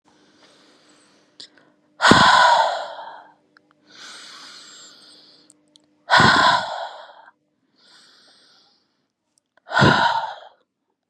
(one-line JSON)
{"exhalation_length": "11.1 s", "exhalation_amplitude": 32768, "exhalation_signal_mean_std_ratio": 0.36, "survey_phase": "beta (2021-08-13 to 2022-03-07)", "age": "18-44", "gender": "Female", "wearing_mask": "No", "symptom_none": true, "smoker_status": "Ex-smoker", "respiratory_condition_asthma": false, "respiratory_condition_other": false, "recruitment_source": "REACT", "submission_delay": "4 days", "covid_test_result": "Negative", "covid_test_method": "RT-qPCR", "influenza_a_test_result": "Negative", "influenza_b_test_result": "Negative"}